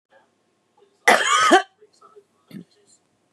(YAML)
cough_length: 3.3 s
cough_amplitude: 29027
cough_signal_mean_std_ratio: 0.32
survey_phase: beta (2021-08-13 to 2022-03-07)
age: 45-64
gender: Female
wearing_mask: 'No'
symptom_none: true
smoker_status: Current smoker (11 or more cigarettes per day)
respiratory_condition_asthma: false
respiratory_condition_other: false
recruitment_source: REACT
submission_delay: 1 day
covid_test_result: Negative
covid_test_method: RT-qPCR